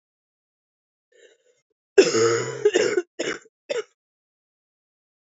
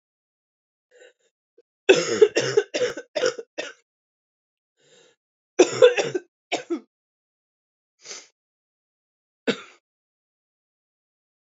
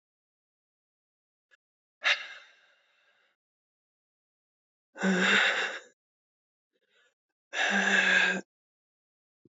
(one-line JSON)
{"cough_length": "5.2 s", "cough_amplitude": 26665, "cough_signal_mean_std_ratio": 0.34, "three_cough_length": "11.4 s", "three_cough_amplitude": 27932, "three_cough_signal_mean_std_ratio": 0.26, "exhalation_length": "9.6 s", "exhalation_amplitude": 8748, "exhalation_signal_mean_std_ratio": 0.36, "survey_phase": "beta (2021-08-13 to 2022-03-07)", "age": "18-44", "gender": "Female", "wearing_mask": "No", "symptom_cough_any": true, "symptom_new_continuous_cough": true, "symptom_runny_or_blocked_nose": true, "symptom_shortness_of_breath": true, "symptom_sore_throat": true, "symptom_abdominal_pain": true, "symptom_fatigue": true, "symptom_fever_high_temperature": true, "symptom_headache": true, "symptom_change_to_sense_of_smell_or_taste": true, "smoker_status": "Never smoked", "respiratory_condition_asthma": true, "respiratory_condition_other": false, "recruitment_source": "Test and Trace", "submission_delay": "0 days", "covid_test_result": "Positive", "covid_test_method": "LFT"}